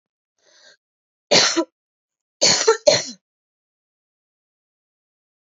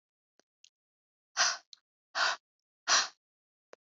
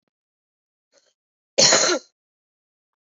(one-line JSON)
{"three_cough_length": "5.5 s", "three_cough_amplitude": 30230, "three_cough_signal_mean_std_ratio": 0.29, "exhalation_length": "3.9 s", "exhalation_amplitude": 7342, "exhalation_signal_mean_std_ratio": 0.29, "cough_length": "3.1 s", "cough_amplitude": 29052, "cough_signal_mean_std_ratio": 0.28, "survey_phase": "beta (2021-08-13 to 2022-03-07)", "age": "18-44", "gender": "Female", "wearing_mask": "No", "symptom_shortness_of_breath": true, "symptom_onset": "13 days", "smoker_status": "Never smoked", "respiratory_condition_asthma": true, "respiratory_condition_other": true, "recruitment_source": "REACT", "submission_delay": "2 days", "covid_test_result": "Negative", "covid_test_method": "RT-qPCR"}